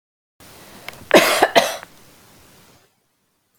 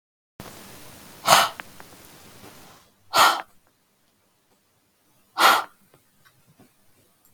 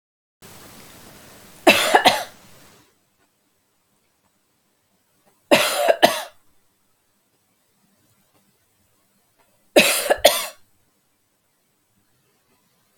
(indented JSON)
{
  "cough_length": "3.6 s",
  "cough_amplitude": 32768,
  "cough_signal_mean_std_ratio": 0.3,
  "exhalation_length": "7.3 s",
  "exhalation_amplitude": 32766,
  "exhalation_signal_mean_std_ratio": 0.27,
  "three_cough_length": "13.0 s",
  "three_cough_amplitude": 32768,
  "three_cough_signal_mean_std_ratio": 0.26,
  "survey_phase": "beta (2021-08-13 to 2022-03-07)",
  "age": "45-64",
  "gender": "Female",
  "wearing_mask": "No",
  "symptom_none": true,
  "smoker_status": "Ex-smoker",
  "respiratory_condition_asthma": true,
  "respiratory_condition_other": false,
  "recruitment_source": "REACT",
  "submission_delay": "2 days",
  "covid_test_result": "Negative",
  "covid_test_method": "RT-qPCR",
  "influenza_a_test_result": "Negative",
  "influenza_b_test_result": "Negative"
}